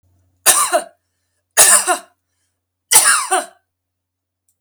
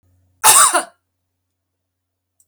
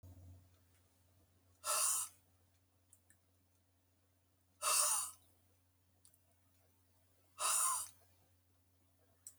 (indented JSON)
{
  "three_cough_length": "4.6 s",
  "three_cough_amplitude": 32768,
  "three_cough_signal_mean_std_ratio": 0.39,
  "cough_length": "2.5 s",
  "cough_amplitude": 32768,
  "cough_signal_mean_std_ratio": 0.31,
  "exhalation_length": "9.4 s",
  "exhalation_amplitude": 3251,
  "exhalation_signal_mean_std_ratio": 0.34,
  "survey_phase": "beta (2021-08-13 to 2022-03-07)",
  "age": "65+",
  "gender": "Female",
  "wearing_mask": "No",
  "symptom_none": true,
  "smoker_status": "Ex-smoker",
  "respiratory_condition_asthma": false,
  "respiratory_condition_other": false,
  "recruitment_source": "REACT",
  "submission_delay": "1 day",
  "covid_test_result": "Negative",
  "covid_test_method": "RT-qPCR"
}